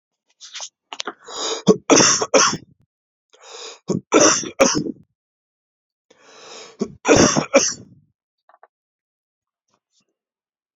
{
  "three_cough_length": "10.8 s",
  "three_cough_amplitude": 31606,
  "three_cough_signal_mean_std_ratio": 0.35,
  "survey_phase": "beta (2021-08-13 to 2022-03-07)",
  "age": "18-44",
  "gender": "Male",
  "wearing_mask": "No",
  "symptom_cough_any": true,
  "symptom_runny_or_blocked_nose": true,
  "symptom_shortness_of_breath": true,
  "symptom_sore_throat": true,
  "symptom_fatigue": true,
  "symptom_fever_high_temperature": true,
  "symptom_onset": "2 days",
  "smoker_status": "Ex-smoker",
  "respiratory_condition_asthma": true,
  "respiratory_condition_other": false,
  "recruitment_source": "Test and Trace",
  "submission_delay": "1 day",
  "covid_test_result": "Positive",
  "covid_test_method": "RT-qPCR",
  "covid_ct_value": 23.6,
  "covid_ct_gene": "ORF1ab gene"
}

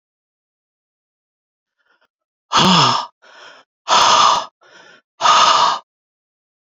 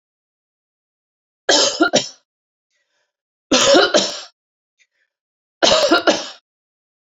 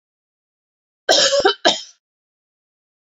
{
  "exhalation_length": "6.7 s",
  "exhalation_amplitude": 30922,
  "exhalation_signal_mean_std_ratio": 0.42,
  "three_cough_length": "7.2 s",
  "three_cough_amplitude": 31648,
  "three_cough_signal_mean_std_ratio": 0.38,
  "cough_length": "3.1 s",
  "cough_amplitude": 29607,
  "cough_signal_mean_std_ratio": 0.34,
  "survey_phase": "beta (2021-08-13 to 2022-03-07)",
  "age": "45-64",
  "gender": "Female",
  "wearing_mask": "No",
  "symptom_none": true,
  "smoker_status": "Ex-smoker",
  "respiratory_condition_asthma": false,
  "respiratory_condition_other": false,
  "recruitment_source": "REACT",
  "submission_delay": "1 day",
  "covid_test_result": "Negative",
  "covid_test_method": "RT-qPCR",
  "influenza_a_test_result": "Negative",
  "influenza_b_test_result": "Negative"
}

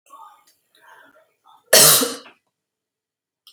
{
  "cough_length": "3.5 s",
  "cough_amplitude": 32768,
  "cough_signal_mean_std_ratio": 0.26,
  "survey_phase": "beta (2021-08-13 to 2022-03-07)",
  "age": "18-44",
  "gender": "Female",
  "wearing_mask": "No",
  "symptom_none": true,
  "smoker_status": "Never smoked",
  "respiratory_condition_asthma": false,
  "respiratory_condition_other": false,
  "recruitment_source": "REACT",
  "submission_delay": "13 days",
  "covid_test_result": "Negative",
  "covid_test_method": "RT-qPCR",
  "influenza_a_test_result": "Negative",
  "influenza_b_test_result": "Negative"
}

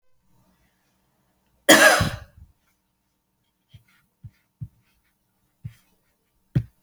{
  "cough_length": "6.8 s",
  "cough_amplitude": 32767,
  "cough_signal_mean_std_ratio": 0.21,
  "survey_phase": "beta (2021-08-13 to 2022-03-07)",
  "age": "45-64",
  "gender": "Female",
  "wearing_mask": "No",
  "symptom_none": true,
  "smoker_status": "Ex-smoker",
  "respiratory_condition_asthma": false,
  "respiratory_condition_other": false,
  "recruitment_source": "REACT",
  "submission_delay": "1 day",
  "covid_test_result": "Negative",
  "covid_test_method": "RT-qPCR"
}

